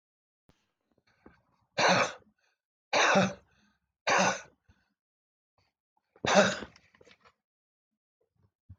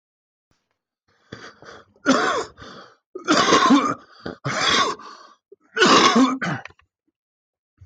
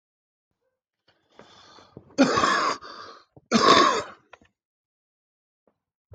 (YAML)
exhalation_length: 8.8 s
exhalation_amplitude: 11115
exhalation_signal_mean_std_ratio: 0.32
three_cough_length: 7.9 s
three_cough_amplitude: 19932
three_cough_signal_mean_std_ratio: 0.47
cough_length: 6.1 s
cough_amplitude: 18597
cough_signal_mean_std_ratio: 0.34
survey_phase: beta (2021-08-13 to 2022-03-07)
age: 45-64
gender: Male
wearing_mask: 'No'
symptom_cough_any: true
smoker_status: Ex-smoker
respiratory_condition_asthma: true
respiratory_condition_other: true
recruitment_source: REACT
submission_delay: 2 days
covid_test_result: Negative
covid_test_method: RT-qPCR